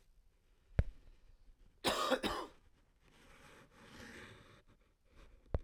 {
  "cough_length": "5.6 s",
  "cough_amplitude": 4219,
  "cough_signal_mean_std_ratio": 0.34,
  "survey_phase": "beta (2021-08-13 to 2022-03-07)",
  "age": "18-44",
  "gender": "Male",
  "wearing_mask": "No",
  "symptom_fatigue": true,
  "symptom_headache": true,
  "symptom_change_to_sense_of_smell_or_taste": true,
  "symptom_other": true,
  "symptom_onset": "2 days",
  "smoker_status": "Never smoked",
  "respiratory_condition_asthma": false,
  "respiratory_condition_other": false,
  "recruitment_source": "Test and Trace",
  "submission_delay": "1 day",
  "covid_test_result": "Positive",
  "covid_test_method": "RT-qPCR",
  "covid_ct_value": 19.4,
  "covid_ct_gene": "ORF1ab gene"
}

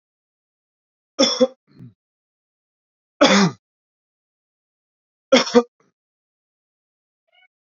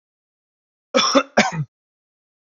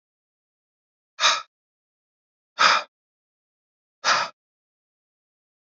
{
  "three_cough_length": "7.7 s",
  "three_cough_amplitude": 31237,
  "three_cough_signal_mean_std_ratio": 0.24,
  "cough_length": "2.6 s",
  "cough_amplitude": 27101,
  "cough_signal_mean_std_ratio": 0.33,
  "exhalation_length": "5.6 s",
  "exhalation_amplitude": 23662,
  "exhalation_signal_mean_std_ratio": 0.25,
  "survey_phase": "beta (2021-08-13 to 2022-03-07)",
  "age": "18-44",
  "gender": "Male",
  "wearing_mask": "No",
  "symptom_cough_any": true,
  "symptom_sore_throat": true,
  "symptom_headache": true,
  "smoker_status": "Ex-smoker",
  "respiratory_condition_asthma": true,
  "respiratory_condition_other": false,
  "recruitment_source": "REACT",
  "submission_delay": "3 days",
  "covid_test_result": "Negative",
  "covid_test_method": "RT-qPCR",
  "influenza_a_test_result": "Negative",
  "influenza_b_test_result": "Negative"
}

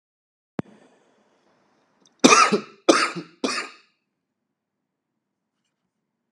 {
  "three_cough_length": "6.3 s",
  "three_cough_amplitude": 32768,
  "three_cough_signal_mean_std_ratio": 0.25,
  "survey_phase": "beta (2021-08-13 to 2022-03-07)",
  "age": "18-44",
  "gender": "Male",
  "wearing_mask": "No",
  "symptom_cough_any": true,
  "symptom_sore_throat": true,
  "symptom_other": true,
  "smoker_status": "Never smoked",
  "respiratory_condition_asthma": false,
  "respiratory_condition_other": false,
  "recruitment_source": "Test and Trace",
  "submission_delay": "1 day",
  "covid_test_result": "Negative",
  "covid_test_method": "RT-qPCR"
}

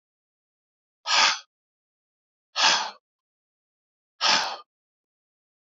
{
  "exhalation_length": "5.7 s",
  "exhalation_amplitude": 16477,
  "exhalation_signal_mean_std_ratio": 0.31,
  "survey_phase": "beta (2021-08-13 to 2022-03-07)",
  "age": "65+",
  "gender": "Male",
  "wearing_mask": "No",
  "symptom_cough_any": true,
  "symptom_runny_or_blocked_nose": true,
  "symptom_headache": true,
  "smoker_status": "Never smoked",
  "respiratory_condition_asthma": false,
  "respiratory_condition_other": false,
  "recruitment_source": "Test and Trace",
  "submission_delay": "3 days",
  "covid_test_result": "Positive",
  "covid_test_method": "RT-qPCR",
  "covid_ct_value": 17.0,
  "covid_ct_gene": "N gene"
}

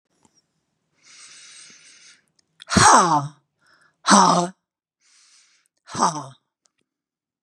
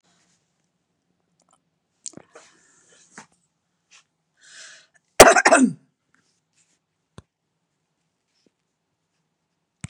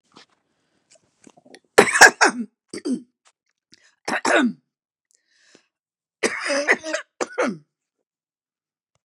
{
  "exhalation_length": "7.4 s",
  "exhalation_amplitude": 31759,
  "exhalation_signal_mean_std_ratio": 0.31,
  "cough_length": "9.9 s",
  "cough_amplitude": 32768,
  "cough_signal_mean_std_ratio": 0.16,
  "three_cough_length": "9.0 s",
  "three_cough_amplitude": 32768,
  "three_cough_signal_mean_std_ratio": 0.29,
  "survey_phase": "beta (2021-08-13 to 2022-03-07)",
  "age": "65+",
  "gender": "Female",
  "wearing_mask": "No",
  "symptom_cough_any": true,
  "smoker_status": "Never smoked",
  "respiratory_condition_asthma": true,
  "respiratory_condition_other": false,
  "recruitment_source": "REACT",
  "submission_delay": "1 day",
  "covid_test_result": "Negative",
  "covid_test_method": "RT-qPCR",
  "influenza_a_test_result": "Negative",
  "influenza_b_test_result": "Negative"
}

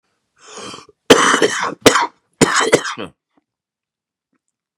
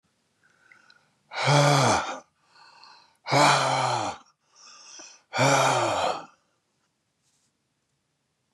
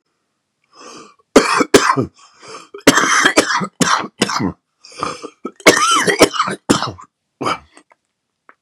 {
  "cough_length": "4.8 s",
  "cough_amplitude": 32768,
  "cough_signal_mean_std_ratio": 0.38,
  "exhalation_length": "8.5 s",
  "exhalation_amplitude": 14868,
  "exhalation_signal_mean_std_ratio": 0.45,
  "three_cough_length": "8.6 s",
  "three_cough_amplitude": 32768,
  "three_cough_signal_mean_std_ratio": 0.45,
  "survey_phase": "beta (2021-08-13 to 2022-03-07)",
  "age": "45-64",
  "gender": "Male",
  "wearing_mask": "No",
  "symptom_cough_any": true,
  "symptom_shortness_of_breath": true,
  "smoker_status": "Ex-smoker",
  "respiratory_condition_asthma": true,
  "respiratory_condition_other": false,
  "recruitment_source": "REACT",
  "submission_delay": "3 days",
  "covid_test_result": "Negative",
  "covid_test_method": "RT-qPCR",
  "influenza_a_test_result": "Negative",
  "influenza_b_test_result": "Negative"
}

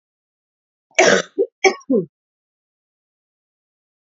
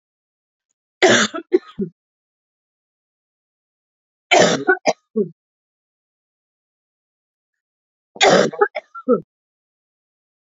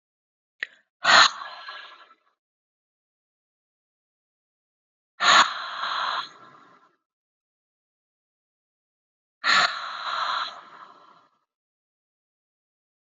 {
  "cough_length": "4.0 s",
  "cough_amplitude": 29215,
  "cough_signal_mean_std_ratio": 0.29,
  "three_cough_length": "10.6 s",
  "three_cough_amplitude": 29886,
  "three_cough_signal_mean_std_ratio": 0.29,
  "exhalation_length": "13.1 s",
  "exhalation_amplitude": 23609,
  "exhalation_signal_mean_std_ratio": 0.28,
  "survey_phase": "beta (2021-08-13 to 2022-03-07)",
  "age": "45-64",
  "gender": "Female",
  "wearing_mask": "No",
  "symptom_cough_any": true,
  "symptom_sore_throat": true,
  "symptom_fever_high_temperature": true,
  "symptom_headache": true,
  "symptom_onset": "3 days",
  "smoker_status": "Never smoked",
  "respiratory_condition_asthma": false,
  "respiratory_condition_other": false,
  "recruitment_source": "Test and Trace",
  "submission_delay": "2 days",
  "covid_test_result": "Positive",
  "covid_test_method": "RT-qPCR",
  "covid_ct_value": 14.8,
  "covid_ct_gene": "N gene",
  "covid_ct_mean": 16.0,
  "covid_viral_load": "5600000 copies/ml",
  "covid_viral_load_category": "High viral load (>1M copies/ml)"
}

